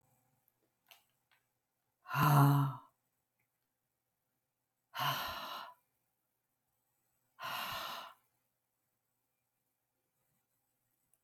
{"exhalation_length": "11.2 s", "exhalation_amplitude": 4467, "exhalation_signal_mean_std_ratio": 0.27, "survey_phase": "alpha (2021-03-01 to 2021-08-12)", "age": "45-64", "gender": "Female", "wearing_mask": "No", "symptom_fatigue": true, "smoker_status": "Never smoked", "respiratory_condition_asthma": false, "respiratory_condition_other": false, "recruitment_source": "REACT", "submission_delay": "2 days", "covid_test_result": "Negative", "covid_test_method": "RT-qPCR"}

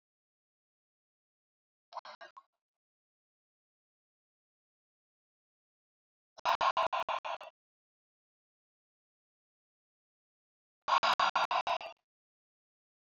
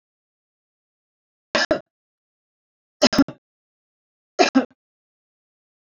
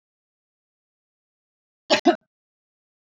{"exhalation_length": "13.1 s", "exhalation_amplitude": 5231, "exhalation_signal_mean_std_ratio": 0.25, "three_cough_length": "5.8 s", "three_cough_amplitude": 27227, "three_cough_signal_mean_std_ratio": 0.22, "cough_length": "3.2 s", "cough_amplitude": 19412, "cough_signal_mean_std_ratio": 0.17, "survey_phase": "beta (2021-08-13 to 2022-03-07)", "age": "65+", "gender": "Female", "wearing_mask": "No", "symptom_none": true, "smoker_status": "Never smoked", "respiratory_condition_asthma": false, "respiratory_condition_other": false, "recruitment_source": "Test and Trace", "submission_delay": "0 days", "covid_test_result": "Negative", "covid_test_method": "LFT"}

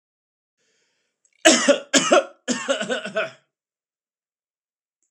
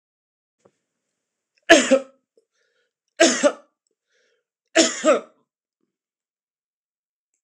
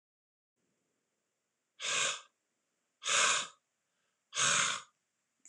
{"cough_length": "5.1 s", "cough_amplitude": 26028, "cough_signal_mean_std_ratio": 0.34, "three_cough_length": "7.4 s", "three_cough_amplitude": 26028, "three_cough_signal_mean_std_ratio": 0.26, "exhalation_length": "5.5 s", "exhalation_amplitude": 5228, "exhalation_signal_mean_std_ratio": 0.38, "survey_phase": "alpha (2021-03-01 to 2021-08-12)", "age": "45-64", "gender": "Male", "wearing_mask": "No", "symptom_none": true, "smoker_status": "Ex-smoker", "respiratory_condition_asthma": false, "respiratory_condition_other": false, "recruitment_source": "REACT", "submission_delay": "1 day", "covid_test_result": "Negative", "covid_test_method": "RT-qPCR"}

